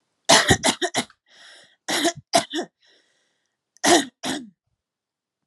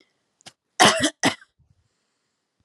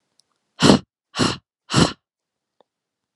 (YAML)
three_cough_length: 5.5 s
three_cough_amplitude: 30794
three_cough_signal_mean_std_ratio: 0.36
cough_length: 2.6 s
cough_amplitude: 28913
cough_signal_mean_std_ratio: 0.28
exhalation_length: 3.2 s
exhalation_amplitude: 32768
exhalation_signal_mean_std_ratio: 0.3
survey_phase: alpha (2021-03-01 to 2021-08-12)
age: 18-44
gender: Female
wearing_mask: 'No'
symptom_none: true
smoker_status: Never smoked
respiratory_condition_asthma: false
respiratory_condition_other: false
recruitment_source: REACT
submission_delay: 1 day
covid_test_result: Negative
covid_test_method: RT-qPCR